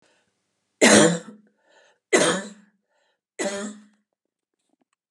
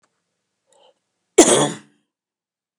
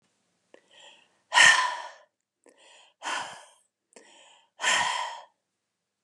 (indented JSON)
{
  "three_cough_length": "5.1 s",
  "three_cough_amplitude": 30752,
  "three_cough_signal_mean_std_ratio": 0.31,
  "cough_length": "2.8 s",
  "cough_amplitude": 32768,
  "cough_signal_mean_std_ratio": 0.25,
  "exhalation_length": "6.0 s",
  "exhalation_amplitude": 19352,
  "exhalation_signal_mean_std_ratio": 0.31,
  "survey_phase": "beta (2021-08-13 to 2022-03-07)",
  "age": "45-64",
  "gender": "Female",
  "wearing_mask": "No",
  "symptom_none": true,
  "smoker_status": "Never smoked",
  "respiratory_condition_asthma": false,
  "respiratory_condition_other": false,
  "recruitment_source": "REACT",
  "submission_delay": "1 day",
  "covid_test_result": "Negative",
  "covid_test_method": "RT-qPCR"
}